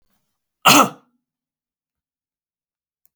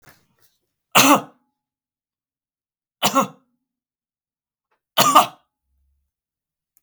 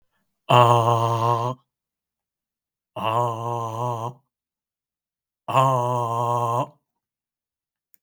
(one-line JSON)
{"cough_length": "3.2 s", "cough_amplitude": 32768, "cough_signal_mean_std_ratio": 0.21, "three_cough_length": "6.8 s", "three_cough_amplitude": 32768, "three_cough_signal_mean_std_ratio": 0.25, "exhalation_length": "8.0 s", "exhalation_amplitude": 32768, "exhalation_signal_mean_std_ratio": 0.46, "survey_phase": "beta (2021-08-13 to 2022-03-07)", "age": "65+", "gender": "Male", "wearing_mask": "No", "symptom_none": true, "smoker_status": "Never smoked", "respiratory_condition_asthma": false, "respiratory_condition_other": false, "recruitment_source": "REACT", "submission_delay": "1 day", "covid_test_result": "Negative", "covid_test_method": "RT-qPCR"}